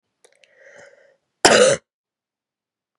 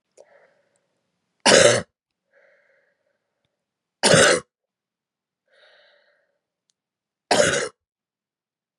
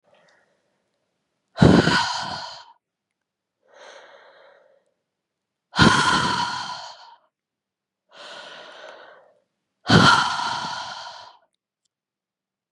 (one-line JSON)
{"cough_length": "3.0 s", "cough_amplitude": 32768, "cough_signal_mean_std_ratio": 0.27, "three_cough_length": "8.8 s", "three_cough_amplitude": 31204, "three_cough_signal_mean_std_ratio": 0.27, "exhalation_length": "12.7 s", "exhalation_amplitude": 32767, "exhalation_signal_mean_std_ratio": 0.34, "survey_phase": "beta (2021-08-13 to 2022-03-07)", "age": "18-44", "gender": "Female", "wearing_mask": "No", "symptom_runny_or_blocked_nose": true, "symptom_fatigue": true, "symptom_change_to_sense_of_smell_or_taste": true, "symptom_onset": "5 days", "smoker_status": "Ex-smoker", "respiratory_condition_asthma": true, "respiratory_condition_other": false, "recruitment_source": "Test and Trace", "submission_delay": "1 day", "covid_test_result": "Positive", "covid_test_method": "RT-qPCR"}